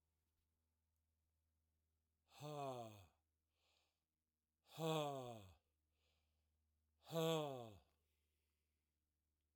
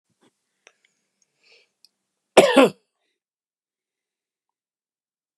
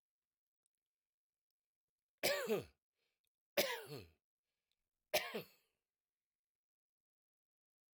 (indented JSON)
{
  "exhalation_length": "9.6 s",
  "exhalation_amplitude": 1134,
  "exhalation_signal_mean_std_ratio": 0.32,
  "cough_length": "5.4 s",
  "cough_amplitude": 32767,
  "cough_signal_mean_std_ratio": 0.17,
  "three_cough_length": "7.9 s",
  "three_cough_amplitude": 3155,
  "three_cough_signal_mean_std_ratio": 0.26,
  "survey_phase": "alpha (2021-03-01 to 2021-08-12)",
  "age": "65+",
  "gender": "Male",
  "wearing_mask": "No",
  "symptom_none": true,
  "symptom_onset": "13 days",
  "smoker_status": "Ex-smoker",
  "respiratory_condition_asthma": false,
  "respiratory_condition_other": false,
  "recruitment_source": "REACT",
  "submission_delay": "1 day",
  "covid_test_result": "Negative",
  "covid_test_method": "RT-qPCR"
}